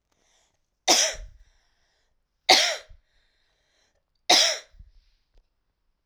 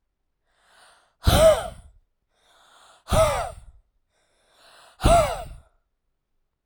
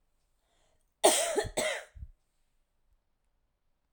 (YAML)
three_cough_length: 6.1 s
three_cough_amplitude: 30211
three_cough_signal_mean_std_ratio: 0.28
exhalation_length: 6.7 s
exhalation_amplitude: 17178
exhalation_signal_mean_std_ratio: 0.33
cough_length: 3.9 s
cough_amplitude: 11347
cough_signal_mean_std_ratio: 0.31
survey_phase: alpha (2021-03-01 to 2021-08-12)
age: 18-44
gender: Female
wearing_mask: 'No'
symptom_new_continuous_cough: true
symptom_shortness_of_breath: true
symptom_fatigue: true
symptom_fever_high_temperature: true
symptom_headache: true
symptom_change_to_sense_of_smell_or_taste: true
symptom_onset: 4 days
smoker_status: Never smoked
respiratory_condition_asthma: true
respiratory_condition_other: false
recruitment_source: Test and Trace
submission_delay: 2 days
covid_test_result: Positive
covid_test_method: RT-qPCR
covid_ct_value: 19.0
covid_ct_gene: ORF1ab gene
covid_ct_mean: 19.5
covid_viral_load: 400000 copies/ml
covid_viral_load_category: Low viral load (10K-1M copies/ml)